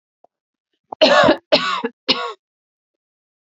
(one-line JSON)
{"three_cough_length": "3.5 s", "three_cough_amplitude": 32098, "three_cough_signal_mean_std_ratio": 0.37, "survey_phase": "beta (2021-08-13 to 2022-03-07)", "age": "18-44", "gender": "Female", "wearing_mask": "No", "symptom_cough_any": true, "symptom_sore_throat": true, "symptom_onset": "4 days", "smoker_status": "Ex-smoker", "respiratory_condition_asthma": false, "respiratory_condition_other": false, "recruitment_source": "REACT", "submission_delay": "2 days", "covid_test_result": "Negative", "covid_test_method": "RT-qPCR"}